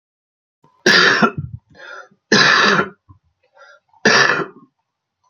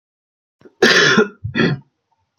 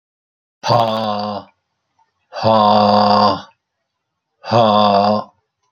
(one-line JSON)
{"three_cough_length": "5.3 s", "three_cough_amplitude": 32768, "three_cough_signal_mean_std_ratio": 0.45, "cough_length": "2.4 s", "cough_amplitude": 29610, "cough_signal_mean_std_ratio": 0.45, "exhalation_length": "5.7 s", "exhalation_amplitude": 30870, "exhalation_signal_mean_std_ratio": 0.56, "survey_phase": "beta (2021-08-13 to 2022-03-07)", "age": "65+", "gender": "Male", "wearing_mask": "No", "symptom_cough_any": true, "symptom_runny_or_blocked_nose": true, "symptom_fatigue": true, "symptom_headache": true, "symptom_change_to_sense_of_smell_or_taste": true, "symptom_other": true, "symptom_onset": "4 days", "smoker_status": "Ex-smoker", "respiratory_condition_asthma": false, "respiratory_condition_other": false, "recruitment_source": "Test and Trace", "submission_delay": "1 day", "covid_test_result": "Positive", "covid_test_method": "RT-qPCR", "covid_ct_value": 22.3, "covid_ct_gene": "ORF1ab gene"}